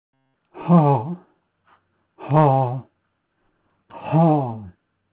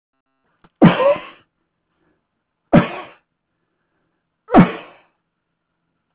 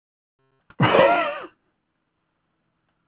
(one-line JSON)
{"exhalation_length": "5.1 s", "exhalation_amplitude": 25406, "exhalation_signal_mean_std_ratio": 0.42, "three_cough_length": "6.1 s", "three_cough_amplitude": 32453, "three_cough_signal_mean_std_ratio": 0.26, "cough_length": "3.1 s", "cough_amplitude": 22451, "cough_signal_mean_std_ratio": 0.34, "survey_phase": "alpha (2021-03-01 to 2021-08-12)", "age": "65+", "gender": "Male", "wearing_mask": "No", "symptom_none": true, "smoker_status": "Ex-smoker", "respiratory_condition_asthma": false, "respiratory_condition_other": false, "recruitment_source": "REACT", "submission_delay": "2 days", "covid_test_result": "Negative", "covid_test_method": "RT-qPCR"}